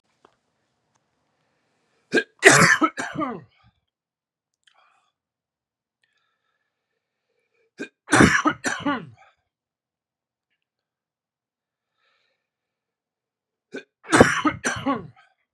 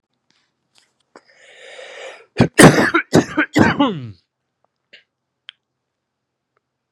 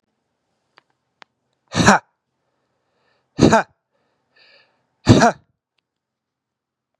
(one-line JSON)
{"three_cough_length": "15.5 s", "three_cough_amplitude": 32768, "three_cough_signal_mean_std_ratio": 0.26, "cough_length": "6.9 s", "cough_amplitude": 32768, "cough_signal_mean_std_ratio": 0.3, "exhalation_length": "7.0 s", "exhalation_amplitude": 32768, "exhalation_signal_mean_std_ratio": 0.23, "survey_phase": "beta (2021-08-13 to 2022-03-07)", "age": "18-44", "gender": "Male", "wearing_mask": "No", "symptom_shortness_of_breath": true, "symptom_diarrhoea": true, "symptom_fatigue": true, "symptom_headache": true, "symptom_onset": "3 days", "smoker_status": "Never smoked", "respiratory_condition_asthma": false, "respiratory_condition_other": false, "recruitment_source": "Test and Trace", "submission_delay": "1 day", "covid_test_result": "Positive", "covid_test_method": "RT-qPCR", "covid_ct_value": 18.8, "covid_ct_gene": "ORF1ab gene", "covid_ct_mean": 19.4, "covid_viral_load": "450000 copies/ml", "covid_viral_load_category": "Low viral load (10K-1M copies/ml)"}